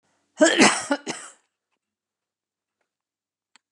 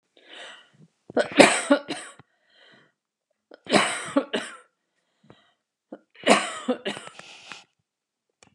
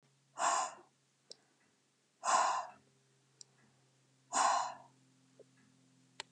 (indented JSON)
{
  "cough_length": "3.7 s",
  "cough_amplitude": 27051,
  "cough_signal_mean_std_ratio": 0.28,
  "three_cough_length": "8.5 s",
  "three_cough_amplitude": 32737,
  "three_cough_signal_mean_std_ratio": 0.3,
  "exhalation_length": "6.3 s",
  "exhalation_amplitude": 3772,
  "exhalation_signal_mean_std_ratio": 0.36,
  "survey_phase": "beta (2021-08-13 to 2022-03-07)",
  "age": "65+",
  "gender": "Female",
  "wearing_mask": "No",
  "symptom_other": true,
  "smoker_status": "Never smoked",
  "respiratory_condition_asthma": false,
  "respiratory_condition_other": false,
  "recruitment_source": "REACT",
  "submission_delay": "2 days",
  "covid_test_result": "Negative",
  "covid_test_method": "RT-qPCR"
}